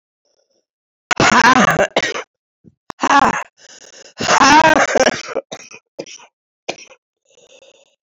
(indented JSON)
{
  "exhalation_length": "8.0 s",
  "exhalation_amplitude": 32186,
  "exhalation_signal_mean_std_ratio": 0.42,
  "survey_phase": "beta (2021-08-13 to 2022-03-07)",
  "age": "65+",
  "gender": "Female",
  "wearing_mask": "No",
  "symptom_cough_any": true,
  "symptom_new_continuous_cough": true,
  "symptom_shortness_of_breath": true,
  "symptom_fatigue": true,
  "symptom_headache": true,
  "symptom_onset": "7 days",
  "smoker_status": "Never smoked",
  "respiratory_condition_asthma": true,
  "respiratory_condition_other": false,
  "recruitment_source": "REACT",
  "submission_delay": "1 day",
  "covid_test_result": "Negative",
  "covid_test_method": "RT-qPCR",
  "influenza_a_test_result": "Negative",
  "influenza_b_test_result": "Negative"
}